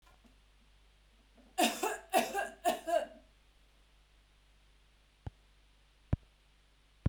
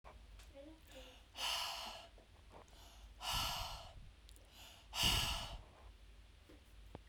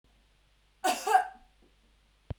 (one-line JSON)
{"three_cough_length": "7.1 s", "three_cough_amplitude": 5623, "three_cough_signal_mean_std_ratio": 0.32, "exhalation_length": "7.1 s", "exhalation_amplitude": 3090, "exhalation_signal_mean_std_ratio": 0.55, "cough_length": "2.4 s", "cough_amplitude": 9680, "cough_signal_mean_std_ratio": 0.31, "survey_phase": "beta (2021-08-13 to 2022-03-07)", "age": "18-44", "gender": "Female", "wearing_mask": "No", "symptom_runny_or_blocked_nose": true, "smoker_status": "Ex-smoker", "respiratory_condition_asthma": false, "respiratory_condition_other": false, "recruitment_source": "REACT", "submission_delay": "1 day", "covid_test_result": "Negative", "covid_test_method": "RT-qPCR"}